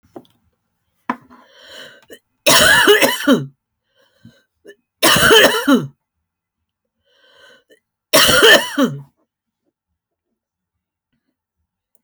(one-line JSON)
{"three_cough_length": "12.0 s", "three_cough_amplitude": 32768, "three_cough_signal_mean_std_ratio": 0.37, "survey_phase": "alpha (2021-03-01 to 2021-08-12)", "age": "65+", "gender": "Female", "wearing_mask": "No", "symptom_none": true, "smoker_status": "Never smoked", "respiratory_condition_asthma": false, "respiratory_condition_other": false, "recruitment_source": "REACT", "submission_delay": "2 days", "covid_test_result": "Negative", "covid_test_method": "RT-qPCR"}